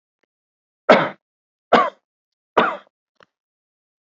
{"three_cough_length": "4.0 s", "three_cough_amplitude": 32768, "three_cough_signal_mean_std_ratio": 0.26, "survey_phase": "beta (2021-08-13 to 2022-03-07)", "age": "45-64", "gender": "Male", "wearing_mask": "No", "symptom_none": true, "smoker_status": "Never smoked", "respiratory_condition_asthma": false, "respiratory_condition_other": false, "recruitment_source": "REACT", "submission_delay": "3 days", "covid_test_result": "Negative", "covid_test_method": "RT-qPCR"}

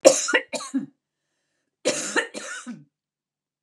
{"cough_length": "3.6 s", "cough_amplitude": 32767, "cough_signal_mean_std_ratio": 0.34, "survey_phase": "beta (2021-08-13 to 2022-03-07)", "age": "65+", "gender": "Female", "wearing_mask": "No", "symptom_cough_any": true, "symptom_runny_or_blocked_nose": true, "symptom_sore_throat": true, "symptom_fatigue": true, "symptom_fever_high_temperature": true, "smoker_status": "Ex-smoker", "respiratory_condition_asthma": false, "respiratory_condition_other": false, "recruitment_source": "REACT", "submission_delay": "3 days", "covid_test_result": "Negative", "covid_test_method": "RT-qPCR"}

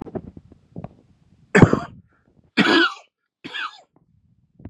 {"three_cough_length": "4.7 s", "three_cough_amplitude": 32768, "three_cough_signal_mean_std_ratio": 0.29, "survey_phase": "beta (2021-08-13 to 2022-03-07)", "age": "18-44", "gender": "Male", "wearing_mask": "No", "symptom_cough_any": true, "symptom_runny_or_blocked_nose": true, "symptom_sore_throat": true, "symptom_onset": "4 days", "smoker_status": "Never smoked", "respiratory_condition_asthma": false, "respiratory_condition_other": false, "recruitment_source": "Test and Trace", "submission_delay": "2 days", "covid_test_result": "Positive", "covid_test_method": "RT-qPCR", "covid_ct_value": 18.3, "covid_ct_gene": "ORF1ab gene", "covid_ct_mean": 18.8, "covid_viral_load": "710000 copies/ml", "covid_viral_load_category": "Low viral load (10K-1M copies/ml)"}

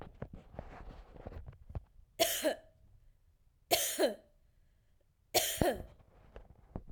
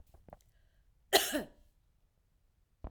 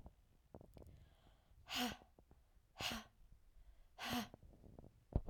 {"three_cough_length": "6.9 s", "three_cough_amplitude": 9793, "three_cough_signal_mean_std_ratio": 0.4, "cough_length": "2.9 s", "cough_amplitude": 9693, "cough_signal_mean_std_ratio": 0.24, "exhalation_length": "5.3 s", "exhalation_amplitude": 2564, "exhalation_signal_mean_std_ratio": 0.41, "survey_phase": "alpha (2021-03-01 to 2021-08-12)", "age": "45-64", "gender": "Female", "wearing_mask": "No", "symptom_none": true, "smoker_status": "Never smoked", "respiratory_condition_asthma": false, "respiratory_condition_other": false, "recruitment_source": "REACT", "submission_delay": "1 day", "covid_test_result": "Negative", "covid_test_method": "RT-qPCR"}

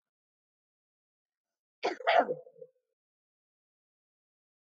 {"cough_length": "4.7 s", "cough_amplitude": 7396, "cough_signal_mean_std_ratio": 0.21, "survey_phase": "alpha (2021-03-01 to 2021-08-12)", "age": "45-64", "gender": "Female", "wearing_mask": "No", "symptom_none": true, "smoker_status": "Ex-smoker", "respiratory_condition_asthma": false, "respiratory_condition_other": false, "recruitment_source": "REACT", "submission_delay": "2 days", "covid_test_result": "Negative", "covid_test_method": "RT-qPCR"}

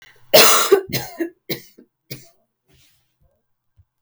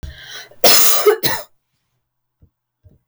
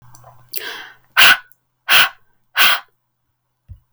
{"three_cough_length": "4.0 s", "three_cough_amplitude": 32768, "three_cough_signal_mean_std_ratio": 0.32, "cough_length": "3.1 s", "cough_amplitude": 32768, "cough_signal_mean_std_ratio": 0.41, "exhalation_length": "3.9 s", "exhalation_amplitude": 32768, "exhalation_signal_mean_std_ratio": 0.35, "survey_phase": "beta (2021-08-13 to 2022-03-07)", "age": "18-44", "gender": "Female", "wearing_mask": "No", "symptom_runny_or_blocked_nose": true, "symptom_abdominal_pain": true, "symptom_fatigue": true, "symptom_headache": true, "smoker_status": "Never smoked", "respiratory_condition_asthma": false, "respiratory_condition_other": false, "recruitment_source": "Test and Trace", "submission_delay": "1 day", "covid_test_result": "Positive", "covid_test_method": "LFT"}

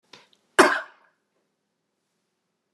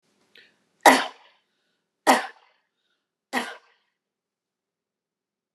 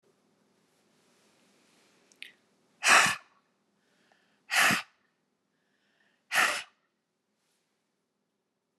{"cough_length": "2.7 s", "cough_amplitude": 29203, "cough_signal_mean_std_ratio": 0.19, "three_cough_length": "5.5 s", "three_cough_amplitude": 29197, "three_cough_signal_mean_std_ratio": 0.2, "exhalation_length": "8.8 s", "exhalation_amplitude": 13620, "exhalation_signal_mean_std_ratio": 0.24, "survey_phase": "beta (2021-08-13 to 2022-03-07)", "age": "65+", "gender": "Female", "wearing_mask": "No", "symptom_none": true, "smoker_status": "Ex-smoker", "respiratory_condition_asthma": false, "respiratory_condition_other": false, "recruitment_source": "REACT", "submission_delay": "2 days", "covid_test_result": "Negative", "covid_test_method": "RT-qPCR"}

